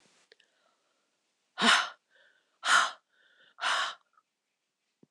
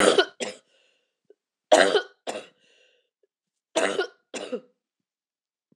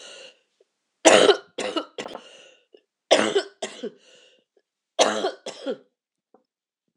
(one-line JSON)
{"exhalation_length": "5.1 s", "exhalation_amplitude": 12018, "exhalation_signal_mean_std_ratio": 0.31, "three_cough_length": "5.8 s", "three_cough_amplitude": 20482, "three_cough_signal_mean_std_ratio": 0.31, "cough_length": "7.0 s", "cough_amplitude": 26028, "cough_signal_mean_std_ratio": 0.32, "survey_phase": "beta (2021-08-13 to 2022-03-07)", "age": "45-64", "gender": "Female", "wearing_mask": "No", "symptom_cough_any": true, "symptom_runny_or_blocked_nose": true, "symptom_fatigue": true, "symptom_headache": true, "symptom_onset": "2 days", "smoker_status": "Ex-smoker", "respiratory_condition_asthma": false, "respiratory_condition_other": false, "recruitment_source": "Test and Trace", "submission_delay": "1 day", "covid_test_result": "Positive", "covid_test_method": "RT-qPCR", "covid_ct_value": 17.3, "covid_ct_gene": "ORF1ab gene", "covid_ct_mean": 17.7, "covid_viral_load": "1600000 copies/ml", "covid_viral_load_category": "High viral load (>1M copies/ml)"}